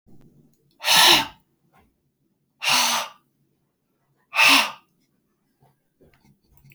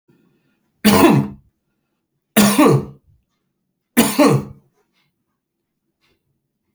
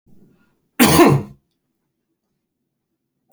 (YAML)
exhalation_length: 6.7 s
exhalation_amplitude: 29419
exhalation_signal_mean_std_ratio: 0.33
three_cough_length: 6.7 s
three_cough_amplitude: 32768
three_cough_signal_mean_std_ratio: 0.36
cough_length: 3.3 s
cough_amplitude: 32767
cough_signal_mean_std_ratio: 0.29
survey_phase: beta (2021-08-13 to 2022-03-07)
age: 45-64
gender: Male
wearing_mask: 'No'
symptom_none: true
smoker_status: Ex-smoker
respiratory_condition_asthma: false
respiratory_condition_other: false
recruitment_source: REACT
submission_delay: 3 days
covid_test_result: Negative
covid_test_method: RT-qPCR
influenza_a_test_result: Negative
influenza_b_test_result: Negative